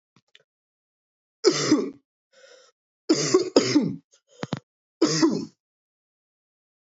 {
  "three_cough_length": "6.9 s",
  "three_cough_amplitude": 24436,
  "three_cough_signal_mean_std_ratio": 0.37,
  "survey_phase": "beta (2021-08-13 to 2022-03-07)",
  "age": "18-44",
  "gender": "Male",
  "wearing_mask": "No",
  "symptom_cough_any": true,
  "symptom_new_continuous_cough": true,
  "symptom_runny_or_blocked_nose": true,
  "symptom_sore_throat": true,
  "symptom_abdominal_pain": true,
  "symptom_fatigue": true,
  "symptom_headache": true,
  "symptom_change_to_sense_of_smell_or_taste": true,
  "symptom_loss_of_taste": true,
  "smoker_status": "Never smoked",
  "respiratory_condition_asthma": false,
  "respiratory_condition_other": false,
  "recruitment_source": "Test and Trace",
  "submission_delay": "1 day",
  "covid_test_result": "Positive",
  "covid_test_method": "RT-qPCR",
  "covid_ct_value": 17.4,
  "covid_ct_gene": "N gene",
  "covid_ct_mean": 18.2,
  "covid_viral_load": "1100000 copies/ml",
  "covid_viral_load_category": "High viral load (>1M copies/ml)"
}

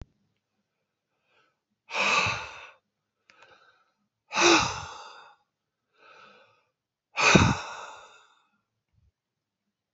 {
  "exhalation_length": "9.9 s",
  "exhalation_amplitude": 25755,
  "exhalation_signal_mean_std_ratio": 0.3,
  "survey_phase": "beta (2021-08-13 to 2022-03-07)",
  "age": "65+",
  "gender": "Male",
  "wearing_mask": "No",
  "symptom_cough_any": true,
  "symptom_shortness_of_breath": true,
  "symptom_fatigue": true,
  "symptom_onset": "13 days",
  "smoker_status": "Ex-smoker",
  "respiratory_condition_asthma": false,
  "respiratory_condition_other": false,
  "recruitment_source": "REACT",
  "submission_delay": "1 day",
  "covid_test_result": "Negative",
  "covid_test_method": "RT-qPCR"
}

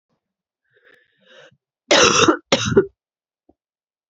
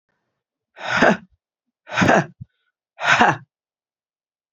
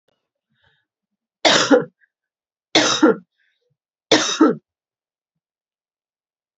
{
  "cough_length": "4.1 s",
  "cough_amplitude": 30396,
  "cough_signal_mean_std_ratio": 0.33,
  "exhalation_length": "4.5 s",
  "exhalation_amplitude": 31418,
  "exhalation_signal_mean_std_ratio": 0.36,
  "three_cough_length": "6.6 s",
  "three_cough_amplitude": 29692,
  "three_cough_signal_mean_std_ratio": 0.31,
  "survey_phase": "beta (2021-08-13 to 2022-03-07)",
  "age": "18-44",
  "gender": "Female",
  "wearing_mask": "No",
  "symptom_cough_any": true,
  "symptom_runny_or_blocked_nose": true,
  "symptom_fatigue": true,
  "symptom_headache": true,
  "symptom_change_to_sense_of_smell_or_taste": true,
  "smoker_status": "Ex-smoker",
  "respiratory_condition_asthma": false,
  "respiratory_condition_other": false,
  "recruitment_source": "Test and Trace",
  "submission_delay": "2 days",
  "covid_test_result": "Positive",
  "covid_test_method": "RT-qPCR",
  "covid_ct_value": 20.6,
  "covid_ct_gene": "ORF1ab gene",
  "covid_ct_mean": 21.7,
  "covid_viral_load": "74000 copies/ml",
  "covid_viral_load_category": "Low viral load (10K-1M copies/ml)"
}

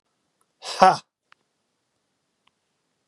{
  "exhalation_length": "3.1 s",
  "exhalation_amplitude": 32767,
  "exhalation_signal_mean_std_ratio": 0.18,
  "survey_phase": "beta (2021-08-13 to 2022-03-07)",
  "age": "45-64",
  "gender": "Male",
  "wearing_mask": "No",
  "symptom_cough_any": true,
  "symptom_runny_or_blocked_nose": true,
  "symptom_shortness_of_breath": true,
  "symptom_fatigue": true,
  "symptom_headache": true,
  "symptom_onset": "4 days",
  "smoker_status": "Ex-smoker",
  "respiratory_condition_asthma": false,
  "respiratory_condition_other": false,
  "recruitment_source": "Test and Trace",
  "submission_delay": "2 days",
  "covid_test_result": "Positive",
  "covid_test_method": "RT-qPCR",
  "covid_ct_value": 18.3,
  "covid_ct_gene": "N gene",
  "covid_ct_mean": 18.6,
  "covid_viral_load": "820000 copies/ml",
  "covid_viral_load_category": "Low viral load (10K-1M copies/ml)"
}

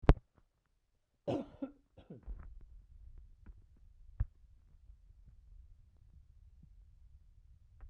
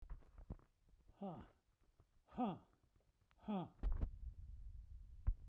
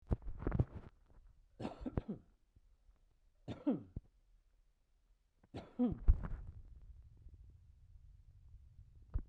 {
  "cough_length": "7.9 s",
  "cough_amplitude": 17183,
  "cough_signal_mean_std_ratio": 0.2,
  "exhalation_length": "5.5 s",
  "exhalation_amplitude": 1433,
  "exhalation_signal_mean_std_ratio": 0.47,
  "three_cough_length": "9.3 s",
  "three_cough_amplitude": 4705,
  "three_cough_signal_mean_std_ratio": 0.33,
  "survey_phase": "beta (2021-08-13 to 2022-03-07)",
  "age": "65+",
  "gender": "Male",
  "wearing_mask": "No",
  "symptom_none": true,
  "smoker_status": "Ex-smoker",
  "respiratory_condition_asthma": false,
  "respiratory_condition_other": false,
  "recruitment_source": "REACT",
  "submission_delay": "1 day",
  "covid_test_result": "Negative",
  "covid_test_method": "RT-qPCR"
}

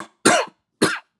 {
  "three_cough_length": "1.2 s",
  "three_cough_amplitude": 32765,
  "three_cough_signal_mean_std_ratio": 0.43,
  "survey_phase": "alpha (2021-03-01 to 2021-08-12)",
  "age": "18-44",
  "gender": "Male",
  "wearing_mask": "Yes",
  "symptom_cough_any": true,
  "symptom_onset": "18 days",
  "smoker_status": "Never smoked",
  "respiratory_condition_asthma": false,
  "respiratory_condition_other": false,
  "recruitment_source": "Test and Trace",
  "submission_delay": "2 days",
  "covid_test_result": "Positive",
  "covid_test_method": "ePCR"
}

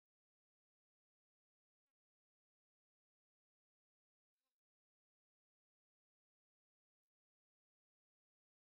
{
  "exhalation_length": "8.7 s",
  "exhalation_amplitude": 3,
  "exhalation_signal_mean_std_ratio": 0.05,
  "survey_phase": "beta (2021-08-13 to 2022-03-07)",
  "age": "18-44",
  "gender": "Female",
  "wearing_mask": "No",
  "symptom_none": true,
  "smoker_status": "Current smoker (11 or more cigarettes per day)",
  "respiratory_condition_asthma": false,
  "respiratory_condition_other": false,
  "recruitment_source": "REACT",
  "submission_delay": "1 day",
  "covid_test_result": "Negative",
  "covid_test_method": "RT-qPCR",
  "influenza_a_test_result": "Negative",
  "influenza_b_test_result": "Negative"
}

